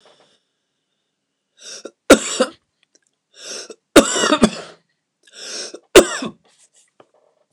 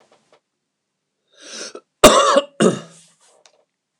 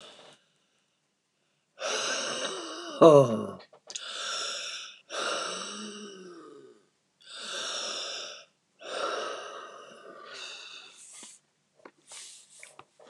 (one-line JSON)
{"three_cough_length": "7.5 s", "three_cough_amplitude": 29204, "three_cough_signal_mean_std_ratio": 0.26, "cough_length": "4.0 s", "cough_amplitude": 29204, "cough_signal_mean_std_ratio": 0.3, "exhalation_length": "13.1 s", "exhalation_amplitude": 19418, "exhalation_signal_mean_std_ratio": 0.35, "survey_phase": "beta (2021-08-13 to 2022-03-07)", "age": "65+", "gender": "Male", "wearing_mask": "No", "symptom_runny_or_blocked_nose": true, "symptom_headache": true, "symptom_onset": "6 days", "smoker_status": "Never smoked", "respiratory_condition_asthma": false, "respiratory_condition_other": false, "recruitment_source": "REACT", "submission_delay": "2 days", "covid_test_result": "Negative", "covid_test_method": "RT-qPCR", "influenza_a_test_result": "Negative", "influenza_b_test_result": "Negative"}